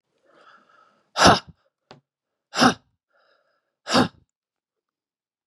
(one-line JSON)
{"exhalation_length": "5.5 s", "exhalation_amplitude": 30783, "exhalation_signal_mean_std_ratio": 0.24, "survey_phase": "beta (2021-08-13 to 2022-03-07)", "age": "45-64", "gender": "Female", "wearing_mask": "No", "symptom_cough_any": true, "symptom_runny_or_blocked_nose": true, "symptom_shortness_of_breath": true, "symptom_sore_throat": true, "symptom_fatigue": true, "symptom_onset": "3 days", "smoker_status": "Never smoked", "respiratory_condition_asthma": false, "respiratory_condition_other": false, "recruitment_source": "Test and Trace", "submission_delay": "2 days", "covid_test_result": "Positive", "covid_test_method": "RT-qPCR", "covid_ct_value": 20.5, "covid_ct_gene": "ORF1ab gene", "covid_ct_mean": 20.9, "covid_viral_load": "140000 copies/ml", "covid_viral_load_category": "Low viral load (10K-1M copies/ml)"}